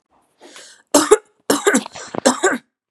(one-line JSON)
{"three_cough_length": "2.9 s", "three_cough_amplitude": 32767, "three_cough_signal_mean_std_ratio": 0.4, "survey_phase": "beta (2021-08-13 to 2022-03-07)", "age": "18-44", "gender": "Female", "wearing_mask": "No", "symptom_cough_any": true, "symptom_runny_or_blocked_nose": true, "symptom_fatigue": true, "symptom_headache": true, "symptom_onset": "6 days", "smoker_status": "Never smoked", "respiratory_condition_asthma": false, "respiratory_condition_other": false, "recruitment_source": "Test and Trace", "submission_delay": "2 days", "covid_test_result": "Positive", "covid_test_method": "RT-qPCR", "covid_ct_value": 25.5, "covid_ct_gene": "ORF1ab gene"}